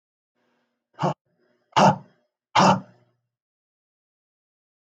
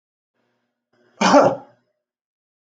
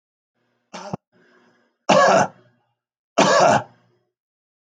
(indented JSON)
{
  "exhalation_length": "4.9 s",
  "exhalation_amplitude": 20249,
  "exhalation_signal_mean_std_ratio": 0.26,
  "cough_length": "2.7 s",
  "cough_amplitude": 28812,
  "cough_signal_mean_std_ratio": 0.28,
  "three_cough_length": "4.8 s",
  "three_cough_amplitude": 27407,
  "three_cough_signal_mean_std_ratio": 0.36,
  "survey_phase": "beta (2021-08-13 to 2022-03-07)",
  "age": "45-64",
  "gender": "Male",
  "wearing_mask": "No",
  "symptom_none": true,
  "smoker_status": "Never smoked",
  "respiratory_condition_asthma": false,
  "respiratory_condition_other": false,
  "recruitment_source": "REACT",
  "submission_delay": "1 day",
  "covid_test_result": "Negative",
  "covid_test_method": "RT-qPCR"
}